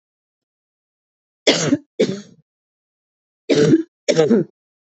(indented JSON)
{
  "cough_length": "4.9 s",
  "cough_amplitude": 28164,
  "cough_signal_mean_std_ratio": 0.38,
  "survey_phase": "alpha (2021-03-01 to 2021-08-12)",
  "age": "18-44",
  "gender": "Female",
  "wearing_mask": "No",
  "symptom_new_continuous_cough": true,
  "symptom_fever_high_temperature": true,
  "symptom_headache": true,
  "symptom_change_to_sense_of_smell_or_taste": true,
  "symptom_loss_of_taste": true,
  "symptom_onset": "2 days",
  "smoker_status": "Ex-smoker",
  "respiratory_condition_asthma": true,
  "respiratory_condition_other": false,
  "recruitment_source": "Test and Trace",
  "submission_delay": "1 day",
  "covid_test_result": "Positive",
  "covid_test_method": "RT-qPCR",
  "covid_ct_value": 14.9,
  "covid_ct_gene": "ORF1ab gene",
  "covid_ct_mean": 15.3,
  "covid_viral_load": "9600000 copies/ml",
  "covid_viral_load_category": "High viral load (>1M copies/ml)"
}